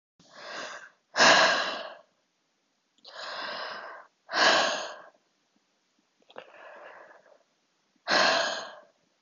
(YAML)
exhalation_length: 9.2 s
exhalation_amplitude: 17252
exhalation_signal_mean_std_ratio: 0.39
survey_phase: beta (2021-08-13 to 2022-03-07)
age: 18-44
gender: Female
wearing_mask: 'No'
symptom_cough_any: true
symptom_headache: true
smoker_status: Ex-smoker
respiratory_condition_asthma: false
respiratory_condition_other: false
recruitment_source: REACT
submission_delay: 3 days
covid_test_result: Negative
covid_test_method: RT-qPCR
influenza_a_test_result: Negative
influenza_b_test_result: Negative